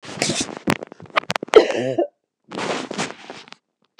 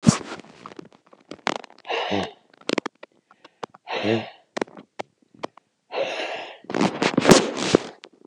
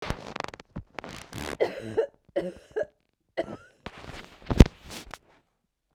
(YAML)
cough_length: 4.0 s
cough_amplitude: 29204
cough_signal_mean_std_ratio: 0.38
exhalation_length: 8.3 s
exhalation_amplitude: 29204
exhalation_signal_mean_std_ratio: 0.36
three_cough_length: 5.9 s
three_cough_amplitude: 32768
three_cough_signal_mean_std_ratio: 0.25
survey_phase: beta (2021-08-13 to 2022-03-07)
age: 45-64
gender: Female
wearing_mask: 'No'
symptom_runny_or_blocked_nose: true
symptom_onset: 13 days
smoker_status: Ex-smoker
respiratory_condition_asthma: false
respiratory_condition_other: false
recruitment_source: REACT
submission_delay: 2 days
covid_test_result: Negative
covid_test_method: RT-qPCR